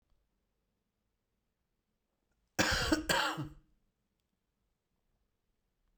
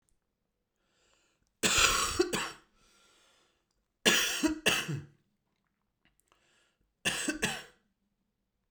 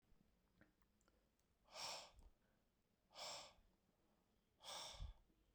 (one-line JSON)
{"cough_length": "6.0 s", "cough_amplitude": 6640, "cough_signal_mean_std_ratio": 0.29, "three_cough_length": "8.7 s", "three_cough_amplitude": 12504, "three_cough_signal_mean_std_ratio": 0.38, "exhalation_length": "5.5 s", "exhalation_amplitude": 331, "exhalation_signal_mean_std_ratio": 0.46, "survey_phase": "alpha (2021-03-01 to 2021-08-12)", "age": "45-64", "gender": "Male", "wearing_mask": "No", "symptom_cough_any": true, "symptom_change_to_sense_of_smell_or_taste": true, "symptom_onset": "5 days", "smoker_status": "Never smoked", "respiratory_condition_asthma": true, "respiratory_condition_other": false, "recruitment_source": "Test and Trace", "submission_delay": "2 days", "covid_test_result": "Positive", "covid_test_method": "RT-qPCR", "covid_ct_value": 20.9, "covid_ct_gene": "ORF1ab gene", "covid_ct_mean": 22.1, "covid_viral_load": "58000 copies/ml", "covid_viral_load_category": "Low viral load (10K-1M copies/ml)"}